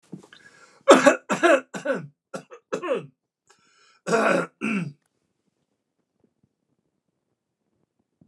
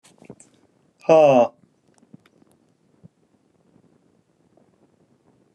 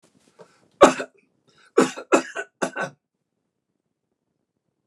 {
  "cough_length": "8.3 s",
  "cough_amplitude": 29203,
  "cough_signal_mean_std_ratio": 0.31,
  "exhalation_length": "5.5 s",
  "exhalation_amplitude": 23797,
  "exhalation_signal_mean_std_ratio": 0.23,
  "three_cough_length": "4.9 s",
  "three_cough_amplitude": 29204,
  "three_cough_signal_mean_std_ratio": 0.23,
  "survey_phase": "alpha (2021-03-01 to 2021-08-12)",
  "age": "65+",
  "gender": "Male",
  "wearing_mask": "No",
  "symptom_headache": true,
  "smoker_status": "Ex-smoker",
  "respiratory_condition_asthma": true,
  "respiratory_condition_other": false,
  "recruitment_source": "REACT",
  "submission_delay": "2 days",
  "covid_test_result": "Negative",
  "covid_test_method": "RT-qPCR"
}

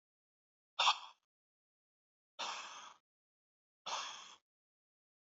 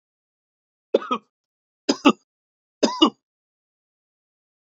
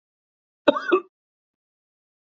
{
  "exhalation_length": "5.4 s",
  "exhalation_amplitude": 3657,
  "exhalation_signal_mean_std_ratio": 0.25,
  "three_cough_length": "4.7 s",
  "three_cough_amplitude": 28208,
  "three_cough_signal_mean_std_ratio": 0.22,
  "cough_length": "2.3 s",
  "cough_amplitude": 27177,
  "cough_signal_mean_std_ratio": 0.22,
  "survey_phase": "beta (2021-08-13 to 2022-03-07)",
  "age": "65+",
  "gender": "Male",
  "wearing_mask": "No",
  "symptom_none": true,
  "smoker_status": "Never smoked",
  "respiratory_condition_asthma": false,
  "respiratory_condition_other": false,
  "recruitment_source": "REACT",
  "submission_delay": "2 days",
  "covid_test_result": "Negative",
  "covid_test_method": "RT-qPCR",
  "influenza_a_test_result": "Negative",
  "influenza_b_test_result": "Negative"
}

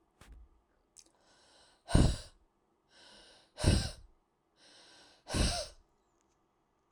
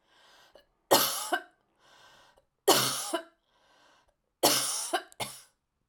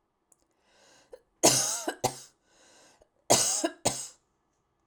{
  "exhalation_length": "6.9 s",
  "exhalation_amplitude": 11208,
  "exhalation_signal_mean_std_ratio": 0.28,
  "three_cough_length": "5.9 s",
  "three_cough_amplitude": 15310,
  "three_cough_signal_mean_std_ratio": 0.37,
  "cough_length": "4.9 s",
  "cough_amplitude": 18426,
  "cough_signal_mean_std_ratio": 0.35,
  "survey_phase": "alpha (2021-03-01 to 2021-08-12)",
  "age": "45-64",
  "gender": "Female",
  "wearing_mask": "No",
  "symptom_none": true,
  "smoker_status": "Ex-smoker",
  "respiratory_condition_asthma": false,
  "respiratory_condition_other": false,
  "recruitment_source": "REACT",
  "submission_delay": "2 days",
  "covid_test_result": "Negative",
  "covid_test_method": "RT-qPCR"
}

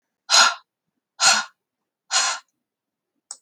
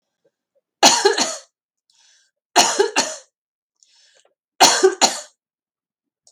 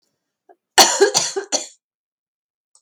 {
  "exhalation_length": "3.4 s",
  "exhalation_amplitude": 31549,
  "exhalation_signal_mean_std_ratio": 0.35,
  "three_cough_length": "6.3 s",
  "three_cough_amplitude": 32768,
  "three_cough_signal_mean_std_ratio": 0.35,
  "cough_length": "2.8 s",
  "cough_amplitude": 32768,
  "cough_signal_mean_std_ratio": 0.33,
  "survey_phase": "beta (2021-08-13 to 2022-03-07)",
  "age": "45-64",
  "gender": "Female",
  "wearing_mask": "No",
  "symptom_cough_any": true,
  "symptom_fatigue": true,
  "symptom_change_to_sense_of_smell_or_taste": true,
  "symptom_loss_of_taste": true,
  "symptom_onset": "5 days",
  "smoker_status": "Ex-smoker",
  "respiratory_condition_asthma": false,
  "respiratory_condition_other": false,
  "recruitment_source": "Test and Trace",
  "submission_delay": "2 days",
  "covid_test_result": "Positive",
  "covid_test_method": "RT-qPCR",
  "covid_ct_value": 24.8,
  "covid_ct_gene": "N gene"
}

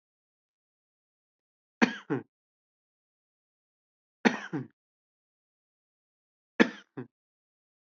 {
  "three_cough_length": "7.9 s",
  "three_cough_amplitude": 15309,
  "three_cough_signal_mean_std_ratio": 0.16,
  "survey_phase": "beta (2021-08-13 to 2022-03-07)",
  "age": "18-44",
  "gender": "Male",
  "wearing_mask": "No",
  "symptom_none": true,
  "smoker_status": "Never smoked",
  "respiratory_condition_asthma": false,
  "respiratory_condition_other": false,
  "recruitment_source": "REACT",
  "submission_delay": "1 day",
  "covid_test_result": "Negative",
  "covid_test_method": "RT-qPCR"
}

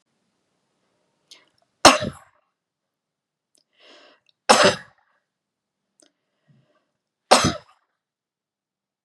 {
  "three_cough_length": "9.0 s",
  "three_cough_amplitude": 32768,
  "three_cough_signal_mean_std_ratio": 0.19,
  "survey_phase": "beta (2021-08-13 to 2022-03-07)",
  "age": "45-64",
  "gender": "Female",
  "wearing_mask": "No",
  "symptom_sore_throat": true,
  "smoker_status": "Never smoked",
  "respiratory_condition_asthma": false,
  "respiratory_condition_other": false,
  "recruitment_source": "REACT",
  "submission_delay": "2 days",
  "covid_test_result": "Negative",
  "covid_test_method": "RT-qPCR",
  "influenza_a_test_result": "Negative",
  "influenza_b_test_result": "Negative"
}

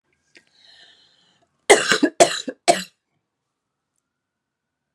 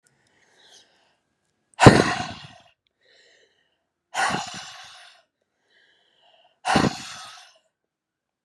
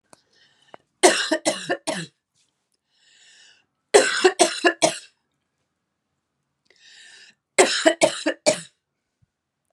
{
  "cough_length": "4.9 s",
  "cough_amplitude": 32768,
  "cough_signal_mean_std_ratio": 0.24,
  "exhalation_length": "8.4 s",
  "exhalation_amplitude": 32768,
  "exhalation_signal_mean_std_ratio": 0.23,
  "three_cough_length": "9.7 s",
  "three_cough_amplitude": 32767,
  "three_cough_signal_mean_std_ratio": 0.32,
  "survey_phase": "beta (2021-08-13 to 2022-03-07)",
  "age": "45-64",
  "gender": "Female",
  "wearing_mask": "No",
  "symptom_cough_any": true,
  "symptom_new_continuous_cough": true,
  "symptom_runny_or_blocked_nose": true,
  "symptom_shortness_of_breath": true,
  "symptom_sore_throat": true,
  "smoker_status": "Ex-smoker",
  "respiratory_condition_asthma": false,
  "respiratory_condition_other": false,
  "recruitment_source": "Test and Trace",
  "submission_delay": "2 days",
  "covid_test_result": "Positive",
  "covid_test_method": "RT-qPCR"
}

